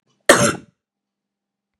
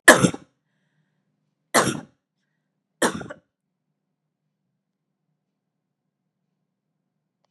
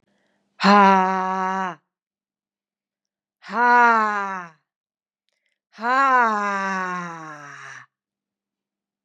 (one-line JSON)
{"cough_length": "1.8 s", "cough_amplitude": 32768, "cough_signal_mean_std_ratio": 0.27, "three_cough_length": "7.5 s", "three_cough_amplitude": 32768, "three_cough_signal_mean_std_ratio": 0.18, "exhalation_length": "9.0 s", "exhalation_amplitude": 30176, "exhalation_signal_mean_std_ratio": 0.41, "survey_phase": "beta (2021-08-13 to 2022-03-07)", "age": "18-44", "gender": "Female", "wearing_mask": "No", "symptom_runny_or_blocked_nose": true, "symptom_sore_throat": true, "symptom_change_to_sense_of_smell_or_taste": true, "symptom_onset": "3 days", "smoker_status": "Never smoked", "respiratory_condition_asthma": false, "respiratory_condition_other": false, "recruitment_source": "Test and Trace", "submission_delay": "1 day", "covid_test_result": "Positive", "covid_test_method": "RT-qPCR", "covid_ct_value": 18.7, "covid_ct_gene": "ORF1ab gene"}